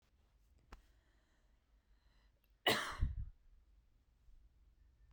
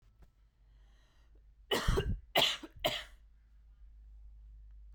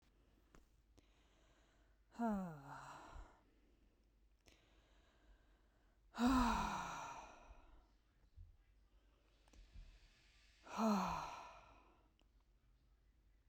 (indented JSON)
{
  "cough_length": "5.1 s",
  "cough_amplitude": 2963,
  "cough_signal_mean_std_ratio": 0.28,
  "three_cough_length": "4.9 s",
  "three_cough_amplitude": 6115,
  "three_cough_signal_mean_std_ratio": 0.4,
  "exhalation_length": "13.5 s",
  "exhalation_amplitude": 2130,
  "exhalation_signal_mean_std_ratio": 0.36,
  "survey_phase": "beta (2021-08-13 to 2022-03-07)",
  "age": "18-44",
  "gender": "Female",
  "wearing_mask": "No",
  "symptom_sore_throat": true,
  "symptom_onset": "2 days",
  "smoker_status": "Never smoked",
  "respiratory_condition_asthma": false,
  "respiratory_condition_other": false,
  "recruitment_source": "REACT",
  "submission_delay": "3 days",
  "covid_test_result": "Negative",
  "covid_test_method": "RT-qPCR"
}